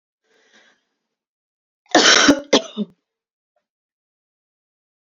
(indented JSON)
{
  "cough_length": "5.0 s",
  "cough_amplitude": 32767,
  "cough_signal_mean_std_ratio": 0.26,
  "survey_phase": "beta (2021-08-13 to 2022-03-07)",
  "age": "18-44",
  "gender": "Female",
  "wearing_mask": "No",
  "symptom_cough_any": true,
  "symptom_runny_or_blocked_nose": true,
  "symptom_sore_throat": true,
  "symptom_fever_high_temperature": true,
  "symptom_headache": true,
  "symptom_onset": "2 days",
  "smoker_status": "Never smoked",
  "respiratory_condition_asthma": false,
  "respiratory_condition_other": false,
  "recruitment_source": "Test and Trace",
  "submission_delay": "2 days",
  "covid_test_result": "Positive",
  "covid_test_method": "ePCR"
}